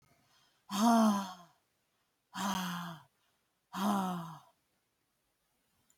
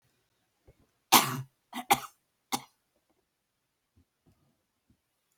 {"exhalation_length": "6.0 s", "exhalation_amplitude": 4923, "exhalation_signal_mean_std_ratio": 0.4, "cough_length": "5.4 s", "cough_amplitude": 21852, "cough_signal_mean_std_ratio": 0.19, "survey_phase": "alpha (2021-03-01 to 2021-08-12)", "age": "65+", "gender": "Female", "wearing_mask": "No", "symptom_none": true, "smoker_status": "Never smoked", "respiratory_condition_asthma": false, "respiratory_condition_other": false, "recruitment_source": "REACT", "submission_delay": "2 days", "covid_test_result": "Negative", "covid_test_method": "RT-qPCR"}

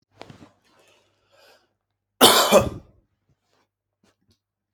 {"cough_length": "4.7 s", "cough_amplitude": 30883, "cough_signal_mean_std_ratio": 0.24, "survey_phase": "alpha (2021-03-01 to 2021-08-12)", "age": "18-44", "gender": "Male", "wearing_mask": "No", "symptom_none": true, "smoker_status": "Ex-smoker", "respiratory_condition_asthma": false, "respiratory_condition_other": false, "recruitment_source": "REACT", "submission_delay": "2 days", "covid_test_result": "Negative", "covid_test_method": "RT-qPCR"}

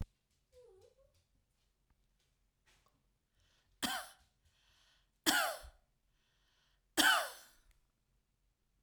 {"three_cough_length": "8.8 s", "three_cough_amplitude": 6518, "three_cough_signal_mean_std_ratio": 0.24, "survey_phase": "alpha (2021-03-01 to 2021-08-12)", "age": "65+", "gender": "Female", "wearing_mask": "No", "symptom_none": true, "smoker_status": "Never smoked", "respiratory_condition_asthma": false, "respiratory_condition_other": false, "recruitment_source": "REACT", "submission_delay": "4 days", "covid_test_result": "Negative", "covid_test_method": "RT-qPCR", "covid_ct_value": 45.0, "covid_ct_gene": "N gene"}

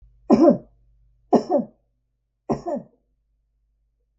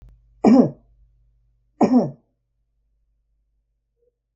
{"three_cough_length": "4.2 s", "three_cough_amplitude": 25740, "three_cough_signal_mean_std_ratio": 0.31, "cough_length": "4.4 s", "cough_amplitude": 26725, "cough_signal_mean_std_ratio": 0.28, "survey_phase": "alpha (2021-03-01 to 2021-08-12)", "age": "65+", "gender": "Female", "wearing_mask": "No", "symptom_none": true, "symptom_onset": "13 days", "smoker_status": "Never smoked", "respiratory_condition_asthma": false, "respiratory_condition_other": false, "recruitment_source": "REACT", "submission_delay": "5 days", "covid_test_result": "Negative", "covid_test_method": "RT-qPCR"}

